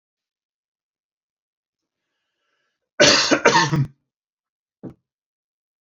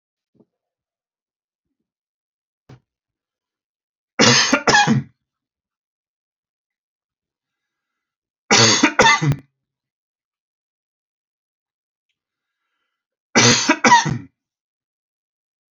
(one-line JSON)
{"cough_length": "5.8 s", "cough_amplitude": 29708, "cough_signal_mean_std_ratio": 0.28, "three_cough_length": "15.7 s", "three_cough_amplitude": 32768, "three_cough_signal_mean_std_ratio": 0.29, "survey_phase": "beta (2021-08-13 to 2022-03-07)", "age": "65+", "gender": "Male", "wearing_mask": "No", "symptom_none": true, "smoker_status": "Never smoked", "respiratory_condition_asthma": false, "respiratory_condition_other": false, "recruitment_source": "REACT", "submission_delay": "2 days", "covid_test_result": "Negative", "covid_test_method": "RT-qPCR"}